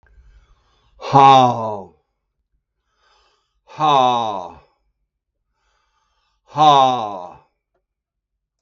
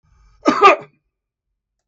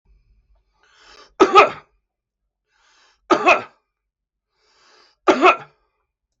{"exhalation_length": "8.6 s", "exhalation_amplitude": 32768, "exhalation_signal_mean_std_ratio": 0.35, "cough_length": "1.9 s", "cough_amplitude": 32766, "cough_signal_mean_std_ratio": 0.3, "three_cough_length": "6.4 s", "three_cough_amplitude": 32766, "three_cough_signal_mean_std_ratio": 0.27, "survey_phase": "beta (2021-08-13 to 2022-03-07)", "age": "65+", "gender": "Male", "wearing_mask": "No", "symptom_loss_of_taste": true, "smoker_status": "Ex-smoker", "respiratory_condition_asthma": true, "respiratory_condition_other": false, "recruitment_source": "REACT", "submission_delay": "1 day", "covid_test_result": "Negative", "covid_test_method": "RT-qPCR"}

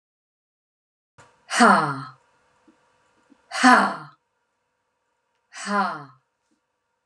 {"exhalation_length": "7.1 s", "exhalation_amplitude": 30752, "exhalation_signal_mean_std_ratio": 0.3, "survey_phase": "beta (2021-08-13 to 2022-03-07)", "age": "45-64", "gender": "Female", "wearing_mask": "No", "symptom_none": true, "smoker_status": "Never smoked", "respiratory_condition_asthma": false, "respiratory_condition_other": false, "recruitment_source": "REACT", "submission_delay": "1 day", "covid_test_result": "Negative", "covid_test_method": "RT-qPCR"}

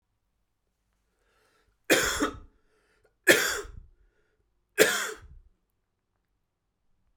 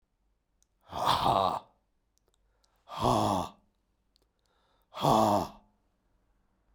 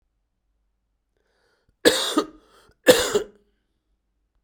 {"three_cough_length": "7.2 s", "three_cough_amplitude": 23983, "three_cough_signal_mean_std_ratio": 0.28, "exhalation_length": "6.7 s", "exhalation_amplitude": 8944, "exhalation_signal_mean_std_ratio": 0.39, "cough_length": "4.4 s", "cough_amplitude": 32767, "cough_signal_mean_std_ratio": 0.27, "survey_phase": "alpha (2021-03-01 to 2021-08-12)", "age": "45-64", "gender": "Male", "wearing_mask": "No", "symptom_cough_any": true, "smoker_status": "Never smoked", "respiratory_condition_asthma": false, "respiratory_condition_other": false, "recruitment_source": "Test and Trace", "submission_delay": "2 days", "covid_test_result": "Positive", "covid_test_method": "RT-qPCR", "covid_ct_value": 16.5, "covid_ct_gene": "ORF1ab gene", "covid_ct_mean": 17.2, "covid_viral_load": "2200000 copies/ml", "covid_viral_load_category": "High viral load (>1M copies/ml)"}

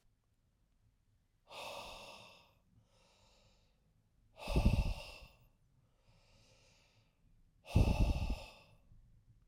{"exhalation_length": "9.5 s", "exhalation_amplitude": 3989, "exhalation_signal_mean_std_ratio": 0.31, "survey_phase": "alpha (2021-03-01 to 2021-08-12)", "age": "45-64", "gender": "Male", "wearing_mask": "No", "symptom_shortness_of_breath": true, "symptom_fatigue": true, "symptom_headache": true, "symptom_loss_of_taste": true, "symptom_onset": "6 days", "smoker_status": "Never smoked", "respiratory_condition_asthma": false, "respiratory_condition_other": false, "recruitment_source": "Test and Trace", "submission_delay": "1 day", "covid_test_result": "Positive", "covid_test_method": "RT-qPCR", "covid_ct_value": 14.8, "covid_ct_gene": "ORF1ab gene", "covid_ct_mean": 15.7, "covid_viral_load": "6900000 copies/ml", "covid_viral_load_category": "High viral load (>1M copies/ml)"}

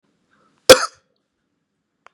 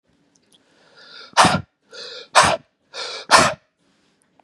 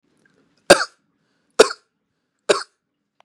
{"cough_length": "2.1 s", "cough_amplitude": 32768, "cough_signal_mean_std_ratio": 0.17, "exhalation_length": "4.4 s", "exhalation_amplitude": 32768, "exhalation_signal_mean_std_ratio": 0.33, "three_cough_length": "3.2 s", "three_cough_amplitude": 32768, "three_cough_signal_mean_std_ratio": 0.2, "survey_phase": "beta (2021-08-13 to 2022-03-07)", "age": "45-64", "gender": "Male", "wearing_mask": "No", "symptom_none": true, "smoker_status": "Ex-smoker", "respiratory_condition_asthma": false, "respiratory_condition_other": false, "recruitment_source": "REACT", "submission_delay": "2 days", "covid_test_result": "Negative", "covid_test_method": "RT-qPCR", "influenza_a_test_result": "Negative", "influenza_b_test_result": "Negative"}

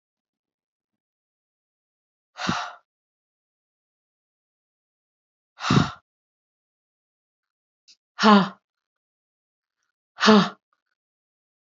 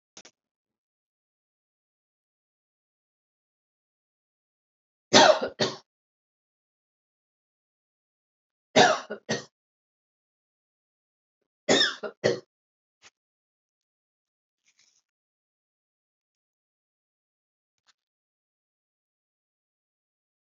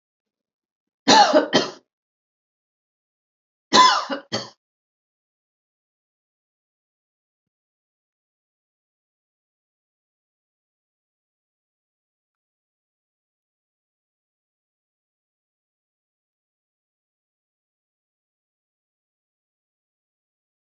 {"exhalation_length": "11.8 s", "exhalation_amplitude": 26851, "exhalation_signal_mean_std_ratio": 0.21, "three_cough_length": "20.6 s", "three_cough_amplitude": 26958, "three_cough_signal_mean_std_ratio": 0.17, "cough_length": "20.7 s", "cough_amplitude": 28513, "cough_signal_mean_std_ratio": 0.16, "survey_phase": "alpha (2021-03-01 to 2021-08-12)", "age": "45-64", "wearing_mask": "No", "symptom_none": true, "smoker_status": "Never smoked", "respiratory_condition_asthma": false, "respiratory_condition_other": false, "recruitment_source": "Test and Trace", "submission_delay": "2 days", "covid_test_result": "Positive", "covid_test_method": "RT-qPCR", "covid_ct_value": 19.9, "covid_ct_gene": "ORF1ab gene", "covid_ct_mean": 20.4, "covid_viral_load": "200000 copies/ml", "covid_viral_load_category": "Low viral load (10K-1M copies/ml)"}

